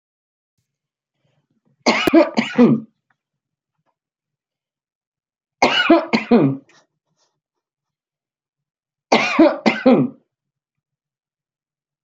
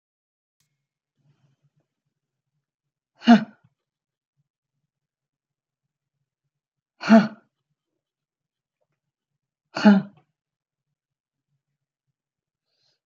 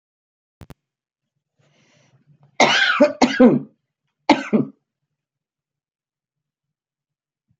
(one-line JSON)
{"three_cough_length": "12.0 s", "three_cough_amplitude": 29315, "three_cough_signal_mean_std_ratio": 0.33, "exhalation_length": "13.1 s", "exhalation_amplitude": 26611, "exhalation_signal_mean_std_ratio": 0.16, "cough_length": "7.6 s", "cough_amplitude": 29296, "cough_signal_mean_std_ratio": 0.29, "survey_phase": "beta (2021-08-13 to 2022-03-07)", "age": "65+", "gender": "Female", "wearing_mask": "No", "symptom_none": true, "smoker_status": "Ex-smoker", "respiratory_condition_asthma": false, "respiratory_condition_other": false, "recruitment_source": "REACT", "submission_delay": "2 days", "covid_test_result": "Negative", "covid_test_method": "RT-qPCR"}